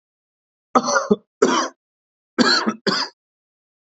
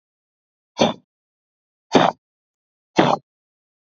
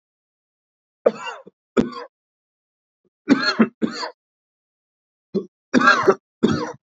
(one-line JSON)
{"cough_length": "3.9 s", "cough_amplitude": 32768, "cough_signal_mean_std_ratio": 0.41, "exhalation_length": "3.9 s", "exhalation_amplitude": 27621, "exhalation_signal_mean_std_ratio": 0.26, "three_cough_length": "7.0 s", "three_cough_amplitude": 27344, "three_cough_signal_mean_std_ratio": 0.33, "survey_phase": "beta (2021-08-13 to 2022-03-07)", "age": "18-44", "gender": "Male", "wearing_mask": "No", "symptom_none": true, "smoker_status": "Never smoked", "respiratory_condition_asthma": false, "respiratory_condition_other": false, "recruitment_source": "REACT", "submission_delay": "18 days", "covid_test_result": "Negative", "covid_test_method": "RT-qPCR"}